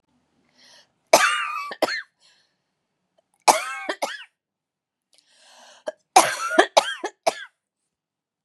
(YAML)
three_cough_length: 8.4 s
three_cough_amplitude: 32768
three_cough_signal_mean_std_ratio: 0.3
survey_phase: beta (2021-08-13 to 2022-03-07)
age: 45-64
gender: Female
wearing_mask: 'No'
symptom_cough_any: true
symptom_new_continuous_cough: true
symptom_runny_or_blocked_nose: true
symptom_sore_throat: true
symptom_headache: true
smoker_status: Never smoked
respiratory_condition_asthma: false
respiratory_condition_other: false
recruitment_source: Test and Trace
submission_delay: 1 day
covid_test_result: Positive
covid_test_method: RT-qPCR
covid_ct_value: 29.5
covid_ct_gene: N gene